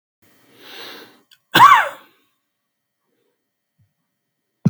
{"cough_length": "4.7 s", "cough_amplitude": 32768, "cough_signal_mean_std_ratio": 0.23, "survey_phase": "beta (2021-08-13 to 2022-03-07)", "age": "45-64", "gender": "Male", "wearing_mask": "No", "symptom_cough_any": true, "smoker_status": "Never smoked", "respiratory_condition_asthma": true, "respiratory_condition_other": false, "recruitment_source": "REACT", "submission_delay": "1 day", "covid_test_result": "Negative", "covid_test_method": "RT-qPCR", "influenza_a_test_result": "Negative", "influenza_b_test_result": "Negative"}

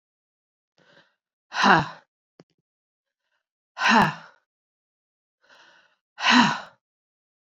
{"exhalation_length": "7.5 s", "exhalation_amplitude": 25733, "exhalation_signal_mean_std_ratio": 0.28, "survey_phase": "beta (2021-08-13 to 2022-03-07)", "age": "45-64", "gender": "Female", "wearing_mask": "No", "symptom_cough_any": true, "symptom_runny_or_blocked_nose": true, "symptom_sore_throat": true, "symptom_fatigue": true, "symptom_other": true, "smoker_status": "Never smoked", "respiratory_condition_asthma": false, "respiratory_condition_other": false, "recruitment_source": "Test and Trace", "submission_delay": "2 days", "covid_test_result": "Positive", "covid_test_method": "ePCR"}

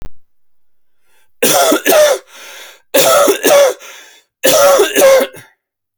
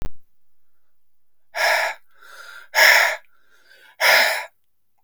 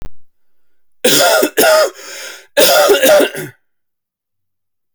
{"three_cough_length": "6.0 s", "three_cough_amplitude": 32768, "three_cough_signal_mean_std_ratio": 0.6, "exhalation_length": "5.0 s", "exhalation_amplitude": 29794, "exhalation_signal_mean_std_ratio": 0.45, "cough_length": "4.9 s", "cough_amplitude": 32768, "cough_signal_mean_std_ratio": 0.55, "survey_phase": "alpha (2021-03-01 to 2021-08-12)", "age": "45-64", "gender": "Male", "wearing_mask": "No", "symptom_cough_any": true, "symptom_shortness_of_breath": true, "symptom_fatigue": true, "symptom_onset": "3 days", "smoker_status": "Ex-smoker", "respiratory_condition_asthma": false, "respiratory_condition_other": false, "recruitment_source": "Test and Trace", "submission_delay": "2 days", "covid_test_result": "Positive", "covid_test_method": "RT-qPCR", "covid_ct_value": 15.7, "covid_ct_gene": "ORF1ab gene", "covid_ct_mean": 16.0, "covid_viral_load": "5700000 copies/ml", "covid_viral_load_category": "High viral load (>1M copies/ml)"}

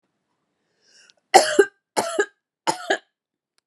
{"three_cough_length": "3.7 s", "three_cough_amplitude": 32767, "three_cough_signal_mean_std_ratio": 0.28, "survey_phase": "beta (2021-08-13 to 2022-03-07)", "age": "18-44", "gender": "Female", "wearing_mask": "No", "symptom_runny_or_blocked_nose": true, "symptom_sore_throat": true, "symptom_fatigue": true, "symptom_headache": true, "symptom_onset": "3 days", "smoker_status": "Never smoked", "respiratory_condition_asthma": false, "respiratory_condition_other": false, "recruitment_source": "Test and Trace", "submission_delay": "2 days", "covid_test_result": "Positive", "covid_test_method": "RT-qPCR", "covid_ct_value": 25.8, "covid_ct_gene": "ORF1ab gene", "covid_ct_mean": 26.1, "covid_viral_load": "2800 copies/ml", "covid_viral_load_category": "Minimal viral load (< 10K copies/ml)"}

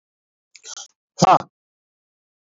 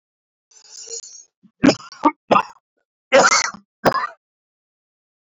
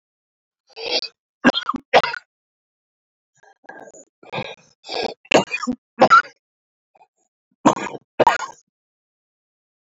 {"exhalation_length": "2.5 s", "exhalation_amplitude": 32768, "exhalation_signal_mean_std_ratio": 0.22, "cough_length": "5.2 s", "cough_amplitude": 27611, "cough_signal_mean_std_ratio": 0.32, "three_cough_length": "9.8 s", "three_cough_amplitude": 28856, "three_cough_signal_mean_std_ratio": 0.29, "survey_phase": "beta (2021-08-13 to 2022-03-07)", "age": "45-64", "gender": "Male", "wearing_mask": "No", "symptom_cough_any": true, "symptom_runny_or_blocked_nose": true, "symptom_shortness_of_breath": true, "symptom_abdominal_pain": true, "symptom_diarrhoea": true, "symptom_fatigue": true, "symptom_fever_high_temperature": true, "symptom_headache": true, "symptom_other": true, "smoker_status": "Ex-smoker", "recruitment_source": "Test and Trace", "submission_delay": "1 day", "covid_test_result": "Positive", "covid_test_method": "RT-qPCR"}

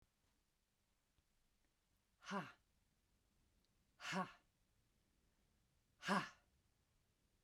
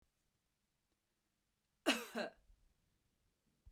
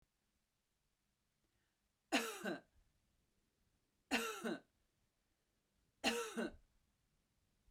{"exhalation_length": "7.4 s", "exhalation_amplitude": 1564, "exhalation_signal_mean_std_ratio": 0.25, "cough_length": "3.7 s", "cough_amplitude": 2893, "cough_signal_mean_std_ratio": 0.22, "three_cough_length": "7.7 s", "three_cough_amplitude": 2722, "three_cough_signal_mean_std_ratio": 0.32, "survey_phase": "beta (2021-08-13 to 2022-03-07)", "age": "45-64", "gender": "Female", "wearing_mask": "No", "symptom_none": true, "smoker_status": "Never smoked", "respiratory_condition_asthma": false, "respiratory_condition_other": false, "recruitment_source": "REACT", "submission_delay": "3 days", "covid_test_result": "Negative", "covid_test_method": "RT-qPCR", "influenza_a_test_result": "Negative", "influenza_b_test_result": "Negative"}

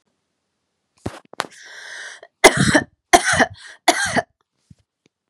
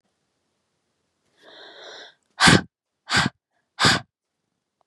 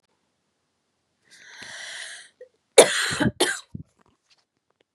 {"three_cough_length": "5.3 s", "three_cough_amplitude": 32768, "three_cough_signal_mean_std_ratio": 0.32, "exhalation_length": "4.9 s", "exhalation_amplitude": 29417, "exhalation_signal_mean_std_ratio": 0.27, "cough_length": "4.9 s", "cough_amplitude": 32768, "cough_signal_mean_std_ratio": 0.25, "survey_phase": "beta (2021-08-13 to 2022-03-07)", "age": "18-44", "gender": "Female", "wearing_mask": "No", "symptom_runny_or_blocked_nose": true, "symptom_change_to_sense_of_smell_or_taste": true, "symptom_loss_of_taste": true, "symptom_onset": "12 days", "smoker_status": "Never smoked", "respiratory_condition_asthma": false, "respiratory_condition_other": false, "recruitment_source": "REACT", "submission_delay": "2 days", "covid_test_result": "Positive", "covid_test_method": "RT-qPCR", "covid_ct_value": 27.0, "covid_ct_gene": "E gene", "influenza_a_test_result": "Unknown/Void", "influenza_b_test_result": "Unknown/Void"}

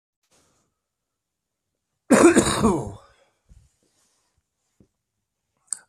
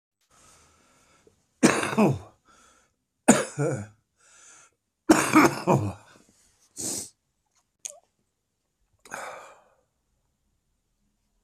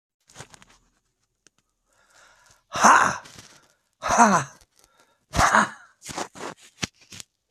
{"cough_length": "5.9 s", "cough_amplitude": 24167, "cough_signal_mean_std_ratio": 0.26, "three_cough_length": "11.4 s", "three_cough_amplitude": 24995, "three_cough_signal_mean_std_ratio": 0.29, "exhalation_length": "7.5 s", "exhalation_amplitude": 25480, "exhalation_signal_mean_std_ratio": 0.31, "survey_phase": "beta (2021-08-13 to 2022-03-07)", "age": "65+", "gender": "Male", "wearing_mask": "No", "symptom_cough_any": true, "smoker_status": "Ex-smoker", "respiratory_condition_asthma": false, "respiratory_condition_other": false, "recruitment_source": "REACT", "submission_delay": "31 days", "covid_test_result": "Negative", "covid_test_method": "RT-qPCR", "influenza_a_test_result": "Unknown/Void", "influenza_b_test_result": "Unknown/Void"}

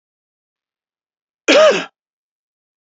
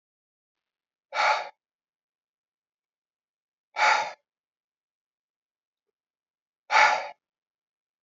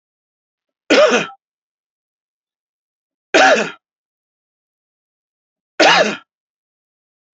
{"cough_length": "2.8 s", "cough_amplitude": 29041, "cough_signal_mean_std_ratio": 0.28, "exhalation_length": "8.0 s", "exhalation_amplitude": 16266, "exhalation_signal_mean_std_ratio": 0.26, "three_cough_length": "7.3 s", "three_cough_amplitude": 30584, "three_cough_signal_mean_std_ratio": 0.3, "survey_phase": "beta (2021-08-13 to 2022-03-07)", "age": "65+", "gender": "Male", "wearing_mask": "No", "symptom_none": true, "smoker_status": "Ex-smoker", "respiratory_condition_asthma": false, "respiratory_condition_other": false, "recruitment_source": "REACT", "submission_delay": "3 days", "covid_test_result": "Negative", "covid_test_method": "RT-qPCR", "influenza_a_test_result": "Negative", "influenza_b_test_result": "Negative"}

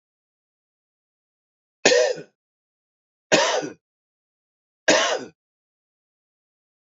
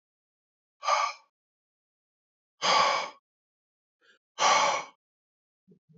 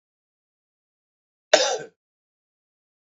{"three_cough_length": "6.9 s", "three_cough_amplitude": 30302, "three_cough_signal_mean_std_ratio": 0.29, "exhalation_length": "6.0 s", "exhalation_amplitude": 10231, "exhalation_signal_mean_std_ratio": 0.35, "cough_length": "3.1 s", "cough_amplitude": 29281, "cough_signal_mean_std_ratio": 0.19, "survey_phase": "beta (2021-08-13 to 2022-03-07)", "age": "45-64", "gender": "Male", "wearing_mask": "No", "symptom_cough_any": true, "symptom_runny_or_blocked_nose": true, "symptom_sore_throat": true, "symptom_diarrhoea": true, "symptom_fatigue": true, "symptom_headache": true, "symptom_change_to_sense_of_smell_or_taste": true, "symptom_onset": "3 days", "smoker_status": "Never smoked", "respiratory_condition_asthma": false, "respiratory_condition_other": false, "recruitment_source": "Test and Trace", "submission_delay": "2 days", "covid_test_result": "Positive", "covid_test_method": "RT-qPCR", "covid_ct_value": 18.2, "covid_ct_gene": "ORF1ab gene"}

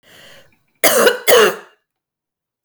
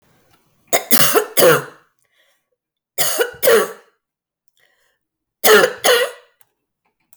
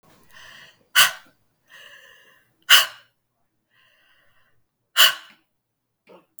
{"cough_length": "2.6 s", "cough_amplitude": 32768, "cough_signal_mean_std_ratio": 0.4, "three_cough_length": "7.2 s", "three_cough_amplitude": 32768, "three_cough_signal_mean_std_ratio": 0.4, "exhalation_length": "6.4 s", "exhalation_amplitude": 32768, "exhalation_signal_mean_std_ratio": 0.22, "survey_phase": "beta (2021-08-13 to 2022-03-07)", "age": "18-44", "gender": "Female", "wearing_mask": "No", "symptom_cough_any": true, "symptom_runny_or_blocked_nose": true, "symptom_fatigue": true, "symptom_headache": true, "smoker_status": "Never smoked", "respiratory_condition_asthma": false, "respiratory_condition_other": false, "recruitment_source": "Test and Trace", "submission_delay": "2 days", "covid_test_result": "Positive", "covid_test_method": "RT-qPCR"}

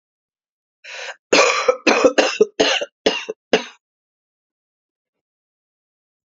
{"cough_length": "6.3 s", "cough_amplitude": 32049, "cough_signal_mean_std_ratio": 0.36, "survey_phase": "beta (2021-08-13 to 2022-03-07)", "age": "45-64", "gender": "Female", "wearing_mask": "No", "symptom_cough_any": true, "symptom_runny_or_blocked_nose": true, "symptom_shortness_of_breath": true, "symptom_fatigue": true, "symptom_headache": true, "symptom_onset": "4 days", "smoker_status": "Current smoker (1 to 10 cigarettes per day)", "respiratory_condition_asthma": false, "respiratory_condition_other": false, "recruitment_source": "Test and Trace", "submission_delay": "1 day", "covid_test_result": "Positive", "covid_test_method": "RT-qPCR", "covid_ct_value": 24.9, "covid_ct_gene": "N gene"}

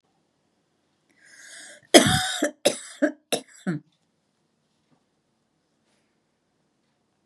{"cough_length": "7.3 s", "cough_amplitude": 32768, "cough_signal_mean_std_ratio": 0.23, "survey_phase": "beta (2021-08-13 to 2022-03-07)", "age": "65+", "gender": "Female", "wearing_mask": "No", "symptom_none": true, "smoker_status": "Ex-smoker", "respiratory_condition_asthma": false, "respiratory_condition_other": false, "recruitment_source": "REACT", "submission_delay": "1 day", "covid_test_result": "Negative", "covid_test_method": "RT-qPCR"}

